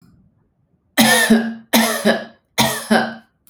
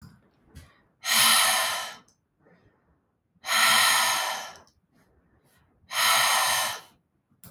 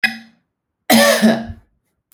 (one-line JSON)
{"three_cough_length": "3.5 s", "three_cough_amplitude": 32768, "three_cough_signal_mean_std_ratio": 0.54, "exhalation_length": "7.5 s", "exhalation_amplitude": 15213, "exhalation_signal_mean_std_ratio": 0.51, "cough_length": "2.1 s", "cough_amplitude": 32767, "cough_signal_mean_std_ratio": 0.45, "survey_phase": "beta (2021-08-13 to 2022-03-07)", "age": "18-44", "gender": "Female", "wearing_mask": "No", "symptom_none": true, "smoker_status": "Never smoked", "respiratory_condition_asthma": false, "respiratory_condition_other": false, "recruitment_source": "REACT", "submission_delay": "1 day", "covid_test_result": "Negative", "covid_test_method": "RT-qPCR"}